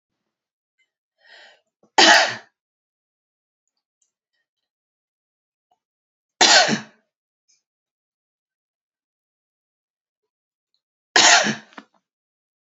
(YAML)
three_cough_length: 12.7 s
three_cough_amplitude: 32767
three_cough_signal_mean_std_ratio: 0.22
survey_phase: beta (2021-08-13 to 2022-03-07)
age: 45-64
gender: Female
wearing_mask: 'No'
symptom_none: true
smoker_status: Ex-smoker
respiratory_condition_asthma: false
respiratory_condition_other: false
recruitment_source: Test and Trace
submission_delay: 3 days
covid_test_result: Negative
covid_test_method: LFT